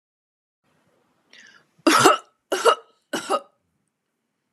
{"three_cough_length": "4.5 s", "three_cough_amplitude": 32767, "three_cough_signal_mean_std_ratio": 0.3, "survey_phase": "beta (2021-08-13 to 2022-03-07)", "age": "18-44", "gender": "Female", "wearing_mask": "No", "symptom_fatigue": true, "smoker_status": "Never smoked", "respiratory_condition_asthma": false, "respiratory_condition_other": false, "recruitment_source": "REACT", "submission_delay": "3 days", "covid_test_result": "Negative", "covid_test_method": "RT-qPCR", "influenza_a_test_result": "Negative", "influenza_b_test_result": "Negative"}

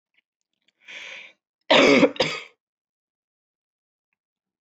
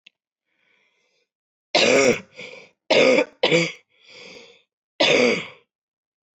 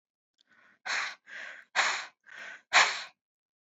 {"cough_length": "4.6 s", "cough_amplitude": 18541, "cough_signal_mean_std_ratio": 0.28, "three_cough_length": "6.4 s", "three_cough_amplitude": 19159, "three_cough_signal_mean_std_ratio": 0.41, "exhalation_length": "3.7 s", "exhalation_amplitude": 13745, "exhalation_signal_mean_std_ratio": 0.36, "survey_phase": "beta (2021-08-13 to 2022-03-07)", "age": "18-44", "gender": "Female", "wearing_mask": "No", "symptom_cough_any": true, "symptom_runny_or_blocked_nose": true, "symptom_fatigue": true, "symptom_fever_high_temperature": true, "symptom_headache": true, "symptom_change_to_sense_of_smell_or_taste": true, "symptom_loss_of_taste": true, "symptom_onset": "4 days", "smoker_status": "Never smoked", "respiratory_condition_asthma": false, "respiratory_condition_other": false, "recruitment_source": "Test and Trace", "submission_delay": "1 day", "covid_test_result": "Positive", "covid_test_method": "ePCR"}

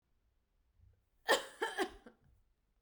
{"cough_length": "2.8 s", "cough_amplitude": 4900, "cough_signal_mean_std_ratio": 0.29, "survey_phase": "beta (2021-08-13 to 2022-03-07)", "age": "18-44", "gender": "Female", "wearing_mask": "Yes", "symptom_none": true, "smoker_status": "Current smoker (1 to 10 cigarettes per day)", "respiratory_condition_asthma": false, "respiratory_condition_other": false, "recruitment_source": "REACT", "submission_delay": "1 day", "covid_test_result": "Negative", "covid_test_method": "RT-qPCR", "influenza_a_test_result": "Negative", "influenza_b_test_result": "Negative"}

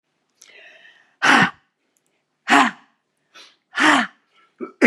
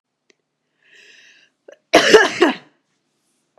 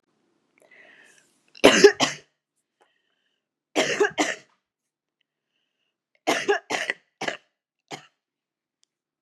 {"exhalation_length": "4.9 s", "exhalation_amplitude": 32767, "exhalation_signal_mean_std_ratio": 0.34, "cough_length": "3.6 s", "cough_amplitude": 32768, "cough_signal_mean_std_ratio": 0.29, "three_cough_length": "9.2 s", "three_cough_amplitude": 32767, "three_cough_signal_mean_std_ratio": 0.25, "survey_phase": "beta (2021-08-13 to 2022-03-07)", "age": "18-44", "gender": "Female", "wearing_mask": "No", "symptom_new_continuous_cough": true, "symptom_runny_or_blocked_nose": true, "symptom_sore_throat": true, "symptom_fatigue": true, "symptom_onset": "2 days", "smoker_status": "Never smoked", "respiratory_condition_asthma": false, "respiratory_condition_other": false, "recruitment_source": "Test and Trace", "submission_delay": "1 day", "covid_test_result": "Positive", "covid_test_method": "RT-qPCR", "covid_ct_value": 18.2, "covid_ct_gene": "ORF1ab gene", "covid_ct_mean": 18.7, "covid_viral_load": "730000 copies/ml", "covid_viral_load_category": "Low viral load (10K-1M copies/ml)"}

